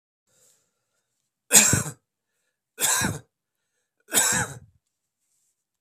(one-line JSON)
{"three_cough_length": "5.8 s", "three_cough_amplitude": 31347, "three_cough_signal_mean_std_ratio": 0.31, "survey_phase": "beta (2021-08-13 to 2022-03-07)", "age": "18-44", "gender": "Male", "wearing_mask": "No", "symptom_cough_any": true, "symptom_runny_or_blocked_nose": true, "symptom_change_to_sense_of_smell_or_taste": true, "smoker_status": "Current smoker (1 to 10 cigarettes per day)", "respiratory_condition_asthma": false, "respiratory_condition_other": false, "recruitment_source": "Test and Trace", "submission_delay": "2 days", "covid_test_result": "Positive", "covid_test_method": "RT-qPCR", "covid_ct_value": 30.0, "covid_ct_gene": "N gene"}